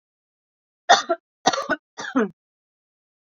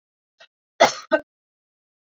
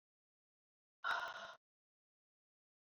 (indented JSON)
{
  "three_cough_length": "3.3 s",
  "three_cough_amplitude": 29832,
  "three_cough_signal_mean_std_ratio": 0.3,
  "cough_length": "2.1 s",
  "cough_amplitude": 27944,
  "cough_signal_mean_std_ratio": 0.21,
  "exhalation_length": "2.9 s",
  "exhalation_amplitude": 1280,
  "exhalation_signal_mean_std_ratio": 0.29,
  "survey_phase": "beta (2021-08-13 to 2022-03-07)",
  "age": "45-64",
  "gender": "Female",
  "wearing_mask": "No",
  "symptom_abdominal_pain": true,
  "symptom_diarrhoea": true,
  "smoker_status": "Current smoker (e-cigarettes or vapes only)",
  "respiratory_condition_asthma": false,
  "respiratory_condition_other": false,
  "recruitment_source": "REACT",
  "submission_delay": "1 day",
  "covid_test_result": "Negative",
  "covid_test_method": "RT-qPCR"
}